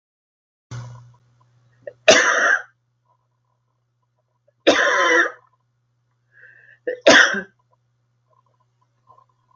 three_cough_length: 9.6 s
three_cough_amplitude: 32768
three_cough_signal_mean_std_ratio: 0.32
survey_phase: beta (2021-08-13 to 2022-03-07)
age: 18-44
gender: Female
wearing_mask: 'No'
symptom_abdominal_pain: true
symptom_onset: 2 days
smoker_status: Never smoked
respiratory_condition_asthma: false
respiratory_condition_other: false
recruitment_source: REACT
submission_delay: 1 day
covid_test_result: Negative
covid_test_method: RT-qPCR
influenza_a_test_result: Negative
influenza_b_test_result: Negative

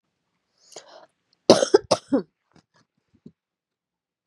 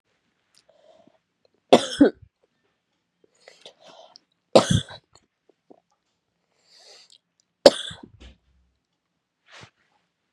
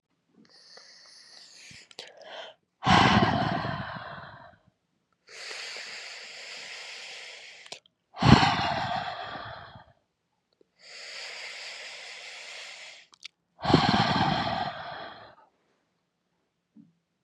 cough_length: 4.3 s
cough_amplitude: 32768
cough_signal_mean_std_ratio: 0.2
three_cough_length: 10.3 s
three_cough_amplitude: 32768
three_cough_signal_mean_std_ratio: 0.16
exhalation_length: 17.2 s
exhalation_amplitude: 27967
exhalation_signal_mean_std_ratio: 0.39
survey_phase: beta (2021-08-13 to 2022-03-07)
age: 18-44
gender: Female
wearing_mask: 'No'
symptom_cough_any: true
symptom_runny_or_blocked_nose: true
symptom_headache: true
symptom_other: true
smoker_status: Never smoked
respiratory_condition_asthma: false
respiratory_condition_other: false
recruitment_source: Test and Trace
submission_delay: 2 days
covid_test_result: Positive
covid_test_method: ePCR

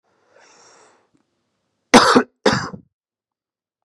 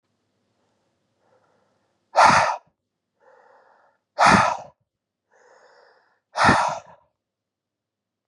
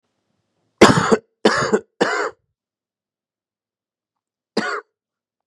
cough_length: 3.8 s
cough_amplitude: 32768
cough_signal_mean_std_ratio: 0.26
exhalation_length: 8.3 s
exhalation_amplitude: 28032
exhalation_signal_mean_std_ratio: 0.29
three_cough_length: 5.5 s
three_cough_amplitude: 32768
three_cough_signal_mean_std_ratio: 0.31
survey_phase: beta (2021-08-13 to 2022-03-07)
age: 18-44
gender: Male
wearing_mask: 'No'
symptom_cough_any: true
symptom_new_continuous_cough: true
symptom_runny_or_blocked_nose: true
symptom_fatigue: true
symptom_headache: true
symptom_change_to_sense_of_smell_or_taste: true
symptom_onset: 3 days
smoker_status: Current smoker (1 to 10 cigarettes per day)
respiratory_condition_asthma: false
respiratory_condition_other: false
recruitment_source: Test and Trace
submission_delay: 1 day
covid_test_result: Positive
covid_test_method: RT-qPCR
covid_ct_value: 18.0
covid_ct_gene: N gene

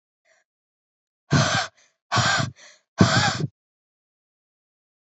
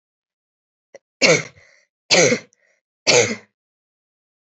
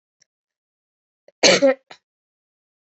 exhalation_length: 5.1 s
exhalation_amplitude: 26024
exhalation_signal_mean_std_ratio: 0.37
three_cough_length: 4.5 s
three_cough_amplitude: 32702
three_cough_signal_mean_std_ratio: 0.32
cough_length: 2.8 s
cough_amplitude: 29148
cough_signal_mean_std_ratio: 0.26
survey_phase: alpha (2021-03-01 to 2021-08-12)
age: 18-44
gender: Female
wearing_mask: 'No'
symptom_fever_high_temperature: true
symptom_headache: true
symptom_loss_of_taste: true
symptom_onset: 3 days
smoker_status: Never smoked
respiratory_condition_asthma: false
respiratory_condition_other: false
recruitment_source: Test and Trace
submission_delay: 1 day
covid_test_result: Positive
covid_test_method: RT-qPCR
covid_ct_value: 28.6
covid_ct_gene: ORF1ab gene
covid_ct_mean: 29.5
covid_viral_load: 220 copies/ml
covid_viral_load_category: Minimal viral load (< 10K copies/ml)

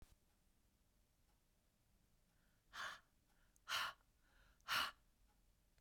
exhalation_length: 5.8 s
exhalation_amplitude: 1138
exhalation_signal_mean_std_ratio: 0.3
survey_phase: beta (2021-08-13 to 2022-03-07)
age: 45-64
gender: Female
wearing_mask: 'No'
symptom_none: true
smoker_status: Ex-smoker
respiratory_condition_asthma: false
respiratory_condition_other: false
recruitment_source: REACT
submission_delay: 1 day
covid_test_result: Negative
covid_test_method: RT-qPCR
influenza_a_test_result: Negative
influenza_b_test_result: Negative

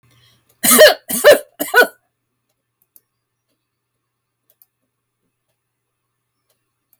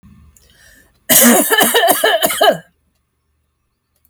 three_cough_length: 7.0 s
three_cough_amplitude: 32768
three_cough_signal_mean_std_ratio: 0.25
cough_length: 4.1 s
cough_amplitude: 32768
cough_signal_mean_std_ratio: 0.49
survey_phase: alpha (2021-03-01 to 2021-08-12)
age: 45-64
gender: Female
wearing_mask: 'No'
symptom_none: true
smoker_status: Never smoked
respiratory_condition_asthma: false
respiratory_condition_other: false
recruitment_source: REACT
submission_delay: 2 days
covid_test_result: Negative
covid_test_method: RT-qPCR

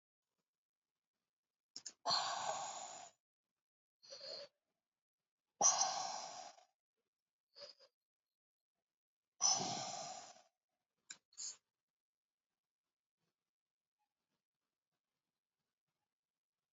exhalation_length: 16.7 s
exhalation_amplitude: 3816
exhalation_signal_mean_std_ratio: 0.28
survey_phase: alpha (2021-03-01 to 2021-08-12)
age: 45-64
gender: Female
wearing_mask: 'No'
symptom_cough_any: true
symptom_shortness_of_breath: true
symptom_abdominal_pain: true
symptom_fatigue: true
symptom_change_to_sense_of_smell_or_taste: true
symptom_onset: 5 days
smoker_status: Ex-smoker
respiratory_condition_asthma: false
respiratory_condition_other: false
recruitment_source: Test and Trace
submission_delay: 1 day
covid_test_result: Positive
covid_test_method: RT-qPCR
covid_ct_value: 15.1
covid_ct_gene: ORF1ab gene
covid_ct_mean: 15.6
covid_viral_load: 7800000 copies/ml
covid_viral_load_category: High viral load (>1M copies/ml)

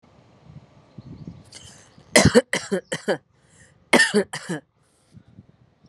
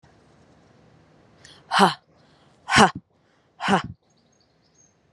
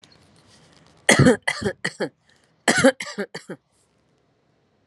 three_cough_length: 5.9 s
three_cough_amplitude: 32767
three_cough_signal_mean_std_ratio: 0.3
exhalation_length: 5.1 s
exhalation_amplitude: 32135
exhalation_signal_mean_std_ratio: 0.26
cough_length: 4.9 s
cough_amplitude: 31281
cough_signal_mean_std_ratio: 0.32
survey_phase: alpha (2021-03-01 to 2021-08-12)
age: 45-64
gender: Female
wearing_mask: 'Yes'
symptom_none: true
smoker_status: Ex-smoker
respiratory_condition_asthma: true
respiratory_condition_other: false
recruitment_source: REACT
submission_delay: 3 days
covid_test_result: Negative
covid_test_method: RT-qPCR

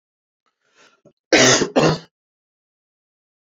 cough_length: 3.4 s
cough_amplitude: 28939
cough_signal_mean_std_ratio: 0.32
survey_phase: alpha (2021-03-01 to 2021-08-12)
age: 45-64
gender: Male
wearing_mask: 'No'
symptom_fatigue: true
symptom_onset: 2 days
smoker_status: Ex-smoker
respiratory_condition_asthma: false
respiratory_condition_other: false
recruitment_source: Test and Trace
submission_delay: 2 days
covid_test_result: Positive
covid_test_method: RT-qPCR
covid_ct_value: 27.8
covid_ct_gene: N gene
covid_ct_mean: 28.3
covid_viral_load: 530 copies/ml
covid_viral_load_category: Minimal viral load (< 10K copies/ml)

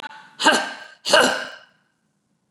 exhalation_length: 2.5 s
exhalation_amplitude: 27766
exhalation_signal_mean_std_ratio: 0.4
survey_phase: beta (2021-08-13 to 2022-03-07)
age: 65+
gender: Female
wearing_mask: 'No'
symptom_abdominal_pain: true
smoker_status: Never smoked
respiratory_condition_asthma: false
respiratory_condition_other: false
recruitment_source: REACT
submission_delay: 3 days
covid_test_result: Negative
covid_test_method: RT-qPCR
influenza_a_test_result: Negative
influenza_b_test_result: Negative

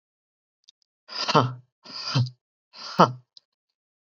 exhalation_length: 4.1 s
exhalation_amplitude: 31152
exhalation_signal_mean_std_ratio: 0.29
survey_phase: beta (2021-08-13 to 2022-03-07)
age: 18-44
gender: Male
wearing_mask: 'No'
symptom_none: true
smoker_status: Never smoked
respiratory_condition_asthma: false
respiratory_condition_other: false
recruitment_source: REACT
submission_delay: 1 day
covid_test_result: Negative
covid_test_method: RT-qPCR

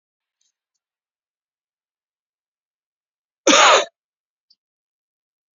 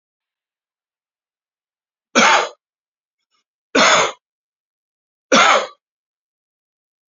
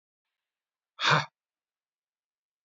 cough_length: 5.5 s
cough_amplitude: 31479
cough_signal_mean_std_ratio: 0.2
three_cough_length: 7.1 s
three_cough_amplitude: 32768
three_cough_signal_mean_std_ratio: 0.3
exhalation_length: 2.6 s
exhalation_amplitude: 13555
exhalation_signal_mean_std_ratio: 0.22
survey_phase: beta (2021-08-13 to 2022-03-07)
age: 45-64
gender: Male
wearing_mask: 'No'
symptom_none: true
smoker_status: Ex-smoker
respiratory_condition_asthma: false
respiratory_condition_other: false
recruitment_source: REACT
submission_delay: 2 days
covid_test_result: Negative
covid_test_method: RT-qPCR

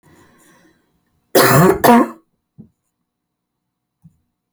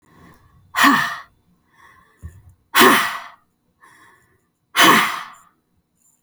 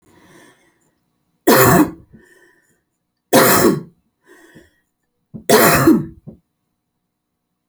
cough_length: 4.5 s
cough_amplitude: 32768
cough_signal_mean_std_ratio: 0.32
exhalation_length: 6.2 s
exhalation_amplitude: 32768
exhalation_signal_mean_std_ratio: 0.35
three_cough_length: 7.7 s
three_cough_amplitude: 32768
three_cough_signal_mean_std_ratio: 0.37
survey_phase: alpha (2021-03-01 to 2021-08-12)
age: 45-64
gender: Female
wearing_mask: 'No'
symptom_diarrhoea: true
smoker_status: Never smoked
respiratory_condition_asthma: false
respiratory_condition_other: false
recruitment_source: REACT
submission_delay: 1 day
covid_test_result: Negative
covid_test_method: RT-qPCR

